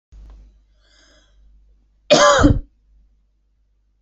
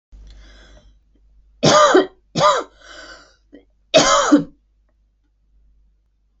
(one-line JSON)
{"cough_length": "4.0 s", "cough_amplitude": 28940, "cough_signal_mean_std_ratio": 0.3, "three_cough_length": "6.4 s", "three_cough_amplitude": 28717, "three_cough_signal_mean_std_ratio": 0.36, "survey_phase": "beta (2021-08-13 to 2022-03-07)", "age": "18-44", "gender": "Female", "wearing_mask": "No", "symptom_none": true, "smoker_status": "Never smoked", "respiratory_condition_asthma": false, "respiratory_condition_other": false, "recruitment_source": "REACT", "submission_delay": "2 days", "covid_test_result": "Negative", "covid_test_method": "RT-qPCR"}